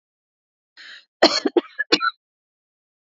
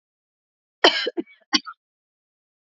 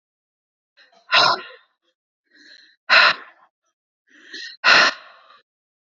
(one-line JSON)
{"three_cough_length": "3.2 s", "three_cough_amplitude": 30378, "three_cough_signal_mean_std_ratio": 0.27, "cough_length": "2.6 s", "cough_amplitude": 29327, "cough_signal_mean_std_ratio": 0.24, "exhalation_length": "6.0 s", "exhalation_amplitude": 29455, "exhalation_signal_mean_std_ratio": 0.31, "survey_phase": "alpha (2021-03-01 to 2021-08-12)", "age": "18-44", "gender": "Female", "wearing_mask": "No", "symptom_none": true, "smoker_status": "Current smoker (e-cigarettes or vapes only)", "respiratory_condition_asthma": false, "respiratory_condition_other": false, "recruitment_source": "REACT", "submission_delay": "12 days", "covid_test_result": "Negative", "covid_test_method": "RT-qPCR"}